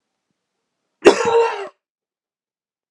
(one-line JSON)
{"cough_length": "2.9 s", "cough_amplitude": 32768, "cough_signal_mean_std_ratio": 0.3, "survey_phase": "beta (2021-08-13 to 2022-03-07)", "age": "18-44", "gender": "Male", "wearing_mask": "No", "symptom_cough_any": true, "symptom_new_continuous_cough": true, "symptom_runny_or_blocked_nose": true, "symptom_sore_throat": true, "symptom_headache": true, "symptom_change_to_sense_of_smell_or_taste": true, "symptom_loss_of_taste": true, "symptom_other": true, "symptom_onset": "5 days", "smoker_status": "Never smoked", "respiratory_condition_asthma": false, "respiratory_condition_other": false, "recruitment_source": "Test and Trace", "submission_delay": "1 day", "covid_test_result": "Positive", "covid_test_method": "RT-qPCR", "covid_ct_value": 18.5, "covid_ct_gene": "ORF1ab gene", "covid_ct_mean": 19.5, "covid_viral_load": "410000 copies/ml", "covid_viral_load_category": "Low viral load (10K-1M copies/ml)"}